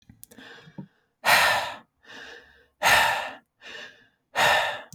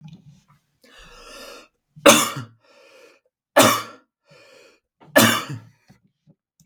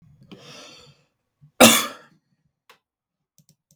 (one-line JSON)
{"exhalation_length": "4.9 s", "exhalation_amplitude": 18528, "exhalation_signal_mean_std_ratio": 0.45, "three_cough_length": "6.7 s", "three_cough_amplitude": 32768, "three_cough_signal_mean_std_ratio": 0.28, "cough_length": "3.8 s", "cough_amplitude": 32768, "cough_signal_mean_std_ratio": 0.2, "survey_phase": "beta (2021-08-13 to 2022-03-07)", "age": "18-44", "gender": "Male", "wearing_mask": "No", "symptom_none": true, "smoker_status": "Never smoked", "respiratory_condition_asthma": false, "respiratory_condition_other": false, "recruitment_source": "REACT", "submission_delay": "0 days", "covid_test_result": "Negative", "covid_test_method": "RT-qPCR", "influenza_a_test_result": "Negative", "influenza_b_test_result": "Negative"}